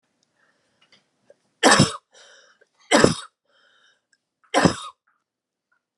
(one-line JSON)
{"three_cough_length": "6.0 s", "three_cough_amplitude": 32768, "three_cough_signal_mean_std_ratio": 0.26, "survey_phase": "beta (2021-08-13 to 2022-03-07)", "age": "18-44", "gender": "Female", "wearing_mask": "No", "symptom_cough_any": true, "symptom_runny_or_blocked_nose": true, "symptom_fatigue": true, "symptom_headache": true, "symptom_change_to_sense_of_smell_or_taste": true, "symptom_loss_of_taste": true, "symptom_onset": "4 days", "smoker_status": "Never smoked", "respiratory_condition_asthma": false, "respiratory_condition_other": false, "recruitment_source": "Test and Trace", "submission_delay": "2 days", "covid_test_result": "Positive", "covid_test_method": "RT-qPCR", "covid_ct_value": 22.9, "covid_ct_gene": "N gene"}